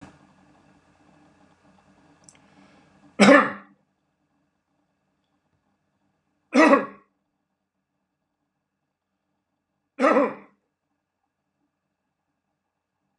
{
  "three_cough_length": "13.2 s",
  "three_cough_amplitude": 28223,
  "three_cough_signal_mean_std_ratio": 0.21,
  "survey_phase": "beta (2021-08-13 to 2022-03-07)",
  "age": "65+",
  "gender": "Male",
  "wearing_mask": "No",
  "symptom_none": true,
  "smoker_status": "Ex-smoker",
  "respiratory_condition_asthma": false,
  "respiratory_condition_other": false,
  "recruitment_source": "REACT",
  "submission_delay": "1 day",
  "covid_test_result": "Negative",
  "covid_test_method": "RT-qPCR"
}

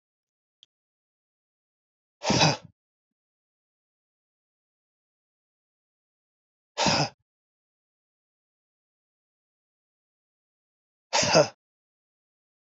{
  "exhalation_length": "12.8 s",
  "exhalation_amplitude": 16773,
  "exhalation_signal_mean_std_ratio": 0.2,
  "survey_phase": "beta (2021-08-13 to 2022-03-07)",
  "age": "45-64",
  "gender": "Male",
  "wearing_mask": "No",
  "symptom_none": true,
  "symptom_onset": "12 days",
  "smoker_status": "Never smoked",
  "respiratory_condition_asthma": true,
  "respiratory_condition_other": false,
  "recruitment_source": "REACT",
  "submission_delay": "3 days",
  "covid_test_result": "Negative",
  "covid_test_method": "RT-qPCR",
  "influenza_a_test_result": "Negative",
  "influenza_b_test_result": "Negative"
}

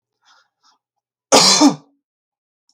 {
  "cough_length": "2.7 s",
  "cough_amplitude": 32768,
  "cough_signal_mean_std_ratio": 0.32,
  "survey_phase": "beta (2021-08-13 to 2022-03-07)",
  "age": "18-44",
  "gender": "Male",
  "wearing_mask": "No",
  "symptom_none": true,
  "smoker_status": "Never smoked",
  "respiratory_condition_asthma": false,
  "respiratory_condition_other": false,
  "recruitment_source": "REACT",
  "submission_delay": "1 day",
  "covid_test_result": "Negative",
  "covid_test_method": "RT-qPCR",
  "influenza_a_test_result": "Negative",
  "influenza_b_test_result": "Negative"
}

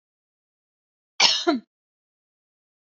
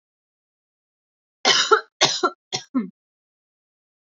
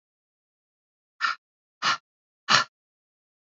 {
  "cough_length": "3.0 s",
  "cough_amplitude": 24551,
  "cough_signal_mean_std_ratio": 0.25,
  "three_cough_length": "4.1 s",
  "three_cough_amplitude": 25363,
  "three_cough_signal_mean_std_ratio": 0.31,
  "exhalation_length": "3.6 s",
  "exhalation_amplitude": 23244,
  "exhalation_signal_mean_std_ratio": 0.24,
  "survey_phase": "alpha (2021-03-01 to 2021-08-12)",
  "age": "18-44",
  "gender": "Female",
  "wearing_mask": "No",
  "symptom_none": true,
  "symptom_onset": "12 days",
  "smoker_status": "Never smoked",
  "respiratory_condition_asthma": false,
  "respiratory_condition_other": false,
  "recruitment_source": "REACT",
  "submission_delay": "1 day",
  "covid_test_result": "Negative",
  "covid_test_method": "RT-qPCR"
}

